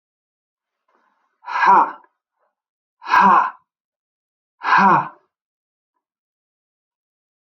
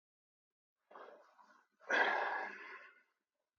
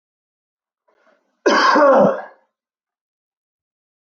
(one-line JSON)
{"exhalation_length": "7.6 s", "exhalation_amplitude": 25969, "exhalation_signal_mean_std_ratio": 0.32, "three_cough_length": "3.6 s", "three_cough_amplitude": 3491, "three_cough_signal_mean_std_ratio": 0.37, "cough_length": "4.0 s", "cough_amplitude": 25019, "cough_signal_mean_std_ratio": 0.36, "survey_phase": "beta (2021-08-13 to 2022-03-07)", "age": "45-64", "gender": "Male", "wearing_mask": "No", "symptom_none": true, "smoker_status": "Never smoked", "respiratory_condition_asthma": false, "respiratory_condition_other": false, "recruitment_source": "REACT", "submission_delay": "4 days", "covid_test_result": "Negative", "covid_test_method": "RT-qPCR"}